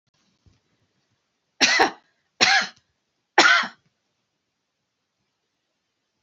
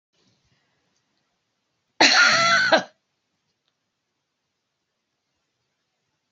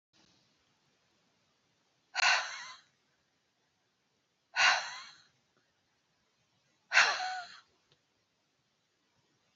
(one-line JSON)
{"three_cough_length": "6.2 s", "three_cough_amplitude": 28848, "three_cough_signal_mean_std_ratio": 0.28, "cough_length": "6.3 s", "cough_amplitude": 30065, "cough_signal_mean_std_ratio": 0.29, "exhalation_length": "9.6 s", "exhalation_amplitude": 9598, "exhalation_signal_mean_std_ratio": 0.26, "survey_phase": "beta (2021-08-13 to 2022-03-07)", "age": "45-64", "gender": "Female", "wearing_mask": "No", "symptom_none": true, "smoker_status": "Never smoked", "respiratory_condition_asthma": false, "respiratory_condition_other": false, "recruitment_source": "REACT", "submission_delay": "3 days", "covid_test_result": "Negative", "covid_test_method": "RT-qPCR"}